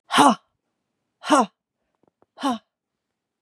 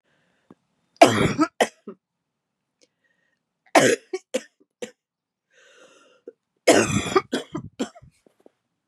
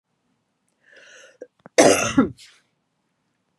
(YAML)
exhalation_length: 3.4 s
exhalation_amplitude: 30318
exhalation_signal_mean_std_ratio: 0.3
three_cough_length: 8.9 s
three_cough_amplitude: 32768
three_cough_signal_mean_std_ratio: 0.29
cough_length: 3.6 s
cough_amplitude: 31099
cough_signal_mean_std_ratio: 0.27
survey_phase: beta (2021-08-13 to 2022-03-07)
age: 65+
gender: Female
wearing_mask: 'No'
symptom_cough_any: true
symptom_headache: true
symptom_onset: 6 days
smoker_status: Ex-smoker
respiratory_condition_asthma: false
respiratory_condition_other: false
recruitment_source: Test and Trace
submission_delay: 1 day
covid_test_result: Positive
covid_test_method: RT-qPCR
covid_ct_value: 17.0
covid_ct_gene: N gene